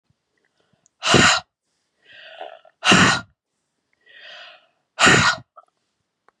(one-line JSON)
{"exhalation_length": "6.4 s", "exhalation_amplitude": 32290, "exhalation_signal_mean_std_ratio": 0.34, "survey_phase": "beta (2021-08-13 to 2022-03-07)", "age": "45-64", "gender": "Female", "wearing_mask": "No", "symptom_runny_or_blocked_nose": true, "symptom_sore_throat": true, "symptom_fatigue": true, "symptom_headache": true, "symptom_onset": "3 days", "smoker_status": "Never smoked", "respiratory_condition_asthma": false, "respiratory_condition_other": false, "recruitment_source": "Test and Trace", "submission_delay": "2 days", "covid_test_result": "Positive", "covid_test_method": "RT-qPCR", "covid_ct_value": 19.0, "covid_ct_gene": "N gene", "covid_ct_mean": 19.5, "covid_viral_load": "410000 copies/ml", "covid_viral_load_category": "Low viral load (10K-1M copies/ml)"}